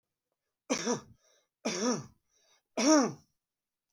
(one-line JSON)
{"three_cough_length": "3.9 s", "three_cough_amplitude": 8451, "three_cough_signal_mean_std_ratio": 0.37, "survey_phase": "beta (2021-08-13 to 2022-03-07)", "age": "65+", "gender": "Male", "wearing_mask": "No", "symptom_none": true, "smoker_status": "Ex-smoker", "respiratory_condition_asthma": false, "respiratory_condition_other": false, "recruitment_source": "REACT", "submission_delay": "4 days", "covid_test_result": "Negative", "covid_test_method": "RT-qPCR", "influenza_a_test_result": "Negative", "influenza_b_test_result": "Negative"}